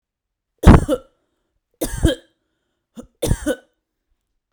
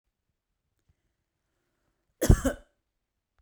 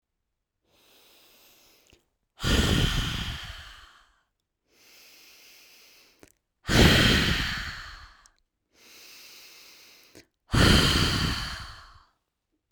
three_cough_length: 4.5 s
three_cough_amplitude: 32768
three_cough_signal_mean_std_ratio: 0.27
cough_length: 3.4 s
cough_amplitude: 21336
cough_signal_mean_std_ratio: 0.17
exhalation_length: 12.7 s
exhalation_amplitude: 18537
exhalation_signal_mean_std_ratio: 0.39
survey_phase: beta (2021-08-13 to 2022-03-07)
age: 18-44
gender: Female
wearing_mask: 'No'
symptom_none: true
smoker_status: Never smoked
respiratory_condition_asthma: false
respiratory_condition_other: false
recruitment_source: REACT
submission_delay: 4 days
covid_test_result: Negative
covid_test_method: RT-qPCR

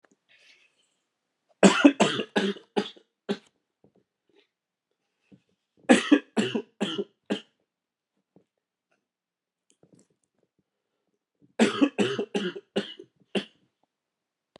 three_cough_length: 14.6 s
three_cough_amplitude: 26366
three_cough_signal_mean_std_ratio: 0.27
survey_phase: beta (2021-08-13 to 2022-03-07)
age: 45-64
gender: Male
wearing_mask: 'No'
symptom_cough_any: true
symptom_new_continuous_cough: true
symptom_runny_or_blocked_nose: true
symptom_shortness_of_breath: true
symptom_sore_throat: true
symptom_fatigue: true
symptom_fever_high_temperature: true
symptom_headache: true
symptom_change_to_sense_of_smell_or_taste: true
symptom_onset: 3 days
smoker_status: Never smoked
respiratory_condition_asthma: false
respiratory_condition_other: false
recruitment_source: Test and Trace
submission_delay: 1 day
covid_test_result: Positive
covid_test_method: RT-qPCR
covid_ct_value: 19.4
covid_ct_gene: ORF1ab gene
covid_ct_mean: 19.7
covid_viral_load: 330000 copies/ml
covid_viral_load_category: Low viral load (10K-1M copies/ml)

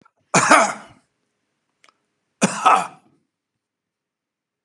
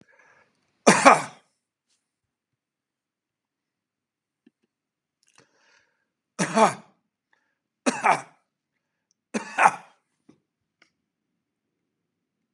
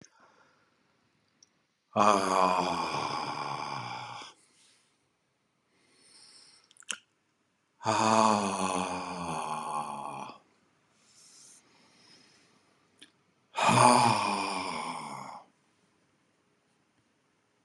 cough_length: 4.6 s
cough_amplitude: 32767
cough_signal_mean_std_ratio: 0.29
three_cough_length: 12.5 s
three_cough_amplitude: 32767
three_cough_signal_mean_std_ratio: 0.2
exhalation_length: 17.6 s
exhalation_amplitude: 16429
exhalation_signal_mean_std_ratio: 0.41
survey_phase: beta (2021-08-13 to 2022-03-07)
age: 65+
gender: Male
wearing_mask: 'No'
symptom_none: true
smoker_status: Ex-smoker
respiratory_condition_asthma: false
respiratory_condition_other: false
recruitment_source: REACT
submission_delay: 1 day
covid_test_result: Negative
covid_test_method: RT-qPCR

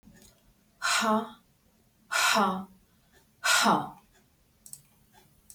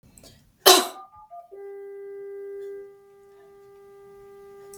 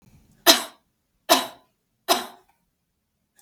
exhalation_length: 5.5 s
exhalation_amplitude: 9748
exhalation_signal_mean_std_ratio: 0.42
cough_length: 4.8 s
cough_amplitude: 32768
cough_signal_mean_std_ratio: 0.28
three_cough_length: 3.4 s
three_cough_amplitude: 32768
three_cough_signal_mean_std_ratio: 0.25
survey_phase: beta (2021-08-13 to 2022-03-07)
age: 45-64
gender: Female
wearing_mask: 'No'
symptom_none: true
symptom_onset: 4 days
smoker_status: Never smoked
respiratory_condition_asthma: false
respiratory_condition_other: false
recruitment_source: REACT
submission_delay: 0 days
covid_test_result: Negative
covid_test_method: RT-qPCR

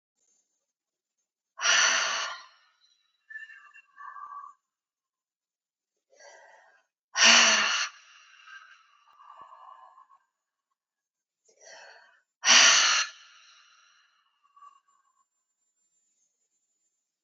exhalation_length: 17.2 s
exhalation_amplitude: 18673
exhalation_signal_mean_std_ratio: 0.28
survey_phase: alpha (2021-03-01 to 2021-08-12)
age: 45-64
gender: Female
wearing_mask: 'No'
symptom_cough_any: true
symptom_fatigue: true
symptom_onset: 5 days
smoker_status: Ex-smoker
respiratory_condition_asthma: false
respiratory_condition_other: false
recruitment_source: Test and Trace
submission_delay: 2 days
covid_test_result: Positive
covid_test_method: RT-qPCR
covid_ct_value: 11.5
covid_ct_gene: ORF1ab gene
covid_ct_mean: 12.3
covid_viral_load: 93000000 copies/ml
covid_viral_load_category: High viral load (>1M copies/ml)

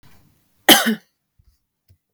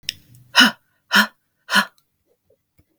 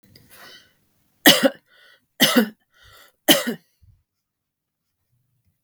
cough_length: 2.1 s
cough_amplitude: 32768
cough_signal_mean_std_ratio: 0.25
exhalation_length: 3.0 s
exhalation_amplitude: 32768
exhalation_signal_mean_std_ratio: 0.29
three_cough_length: 5.6 s
three_cough_amplitude: 32768
three_cough_signal_mean_std_ratio: 0.26
survey_phase: beta (2021-08-13 to 2022-03-07)
age: 45-64
gender: Female
wearing_mask: 'No'
symptom_none: true
smoker_status: Never smoked
respiratory_condition_asthma: false
respiratory_condition_other: false
recruitment_source: Test and Trace
submission_delay: 1 day
covid_test_result: Negative
covid_test_method: RT-qPCR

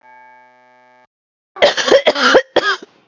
cough_length: 3.1 s
cough_amplitude: 32768
cough_signal_mean_std_ratio: 0.43
survey_phase: beta (2021-08-13 to 2022-03-07)
age: 45-64
gender: Female
wearing_mask: 'No'
symptom_sore_throat: true
symptom_fatigue: true
symptom_onset: 8 days
smoker_status: Never smoked
respiratory_condition_asthma: false
respiratory_condition_other: false
recruitment_source: REACT
submission_delay: 1 day
covid_test_result: Negative
covid_test_method: RT-qPCR
influenza_a_test_result: Negative
influenza_b_test_result: Negative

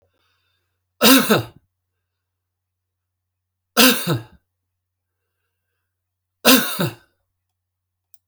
three_cough_length: 8.3 s
three_cough_amplitude: 32768
three_cough_signal_mean_std_ratio: 0.27
survey_phase: alpha (2021-03-01 to 2021-08-12)
age: 65+
gender: Male
wearing_mask: 'No'
symptom_none: true
smoker_status: Never smoked
respiratory_condition_asthma: false
respiratory_condition_other: false
recruitment_source: REACT
submission_delay: 2 days
covid_test_result: Negative
covid_test_method: RT-qPCR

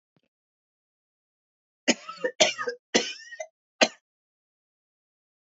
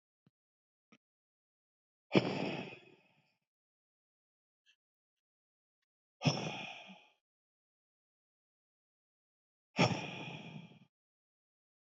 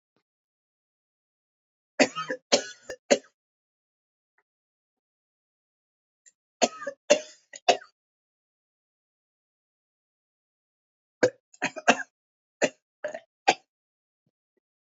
cough_length: 5.5 s
cough_amplitude: 24416
cough_signal_mean_std_ratio: 0.24
exhalation_length: 11.9 s
exhalation_amplitude: 6875
exhalation_signal_mean_std_ratio: 0.24
three_cough_length: 14.8 s
three_cough_amplitude: 21858
three_cough_signal_mean_std_ratio: 0.19
survey_phase: beta (2021-08-13 to 2022-03-07)
age: 18-44
gender: Male
wearing_mask: 'No'
symptom_none: true
smoker_status: Never smoked
respiratory_condition_asthma: false
respiratory_condition_other: false
recruitment_source: REACT
submission_delay: 0 days
covid_test_result: Negative
covid_test_method: RT-qPCR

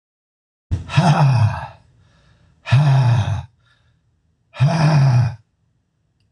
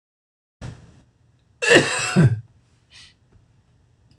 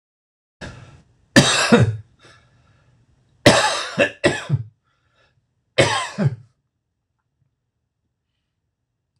exhalation_length: 6.3 s
exhalation_amplitude: 24232
exhalation_signal_mean_std_ratio: 0.56
cough_length: 4.2 s
cough_amplitude: 26028
cough_signal_mean_std_ratio: 0.32
three_cough_length: 9.2 s
three_cough_amplitude: 26028
three_cough_signal_mean_std_ratio: 0.33
survey_phase: beta (2021-08-13 to 2022-03-07)
age: 65+
gender: Male
wearing_mask: 'No'
symptom_cough_any: true
smoker_status: Ex-smoker
respiratory_condition_asthma: false
respiratory_condition_other: false
recruitment_source: REACT
submission_delay: 1 day
covid_test_result: Negative
covid_test_method: RT-qPCR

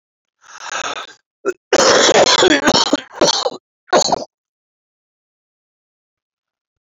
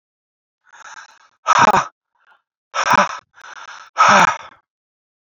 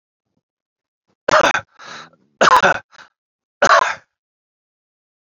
cough_length: 6.8 s
cough_amplitude: 30040
cough_signal_mean_std_ratio: 0.43
exhalation_length: 5.4 s
exhalation_amplitude: 28582
exhalation_signal_mean_std_ratio: 0.36
three_cough_length: 5.2 s
three_cough_amplitude: 30694
three_cough_signal_mean_std_ratio: 0.33
survey_phase: beta (2021-08-13 to 2022-03-07)
age: 45-64
gender: Male
wearing_mask: 'No'
symptom_cough_any: true
symptom_runny_or_blocked_nose: true
symptom_sore_throat: true
symptom_fever_high_temperature: true
symptom_onset: 3 days
smoker_status: Never smoked
respiratory_condition_asthma: false
respiratory_condition_other: false
recruitment_source: Test and Trace
submission_delay: 1 day
covid_test_result: Positive
covid_test_method: RT-qPCR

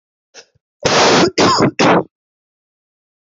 cough_length: 3.2 s
cough_amplitude: 32767
cough_signal_mean_std_ratio: 0.5
survey_phase: beta (2021-08-13 to 2022-03-07)
age: 18-44
gender: Male
wearing_mask: 'Yes'
symptom_cough_any: true
symptom_new_continuous_cough: true
symptom_runny_or_blocked_nose: true
symptom_sore_throat: true
symptom_abdominal_pain: true
symptom_fatigue: true
symptom_fever_high_temperature: true
symptom_headache: true
symptom_change_to_sense_of_smell_or_taste: true
symptom_loss_of_taste: true
symptom_other: true
symptom_onset: 3 days
smoker_status: Ex-smoker
respiratory_condition_asthma: false
respiratory_condition_other: false
recruitment_source: Test and Trace
submission_delay: 1 day
covid_test_result: Positive
covid_test_method: RT-qPCR
covid_ct_value: 15.4
covid_ct_gene: ORF1ab gene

